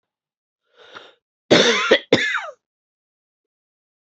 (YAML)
cough_length: 4.1 s
cough_amplitude: 29215
cough_signal_mean_std_ratio: 0.32
survey_phase: beta (2021-08-13 to 2022-03-07)
age: 45-64
gender: Female
wearing_mask: 'No'
symptom_cough_any: true
symptom_runny_or_blocked_nose: true
symptom_shortness_of_breath: true
symptom_sore_throat: true
symptom_fatigue: true
symptom_headache: true
symptom_other: true
smoker_status: Never smoked
respiratory_condition_asthma: false
respiratory_condition_other: false
recruitment_source: Test and Trace
submission_delay: -5 days
covid_test_result: Positive
covid_test_method: LFT